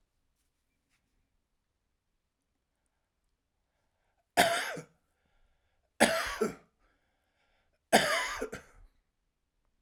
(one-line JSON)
{"three_cough_length": "9.8 s", "three_cough_amplitude": 13358, "three_cough_signal_mean_std_ratio": 0.26, "survey_phase": "alpha (2021-03-01 to 2021-08-12)", "age": "45-64", "gender": "Male", "wearing_mask": "No", "symptom_cough_any": true, "symptom_shortness_of_breath": true, "symptom_fatigue": true, "smoker_status": "Ex-smoker", "respiratory_condition_asthma": false, "respiratory_condition_other": true, "recruitment_source": "REACT", "submission_delay": "2 days", "covid_test_result": "Negative", "covid_test_method": "RT-qPCR"}